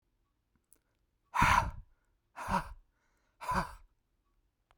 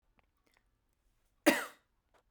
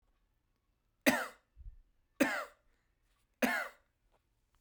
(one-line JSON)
{"exhalation_length": "4.8 s", "exhalation_amplitude": 7537, "exhalation_signal_mean_std_ratio": 0.32, "cough_length": "2.3 s", "cough_amplitude": 9088, "cough_signal_mean_std_ratio": 0.19, "three_cough_length": "4.6 s", "three_cough_amplitude": 7807, "three_cough_signal_mean_std_ratio": 0.29, "survey_phase": "beta (2021-08-13 to 2022-03-07)", "age": "18-44", "gender": "Male", "wearing_mask": "No", "symptom_none": true, "smoker_status": "Never smoked", "respiratory_condition_asthma": false, "respiratory_condition_other": false, "recruitment_source": "REACT", "submission_delay": "1 day", "covid_test_result": "Negative", "covid_test_method": "RT-qPCR", "influenza_a_test_result": "Negative", "influenza_b_test_result": "Negative"}